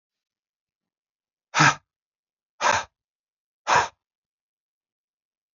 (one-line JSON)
{"exhalation_length": "5.5 s", "exhalation_amplitude": 21745, "exhalation_signal_mean_std_ratio": 0.24, "survey_phase": "beta (2021-08-13 to 2022-03-07)", "age": "45-64", "gender": "Male", "wearing_mask": "No", "symptom_cough_any": true, "symptom_runny_or_blocked_nose": true, "smoker_status": "Current smoker (11 or more cigarettes per day)", "respiratory_condition_asthma": true, "respiratory_condition_other": false, "recruitment_source": "Test and Trace", "submission_delay": "2 days", "covid_test_result": "Positive", "covid_test_method": "RT-qPCR", "covid_ct_value": 15.7, "covid_ct_gene": "ORF1ab gene", "covid_ct_mean": 16.1, "covid_viral_load": "5400000 copies/ml", "covid_viral_load_category": "High viral load (>1M copies/ml)"}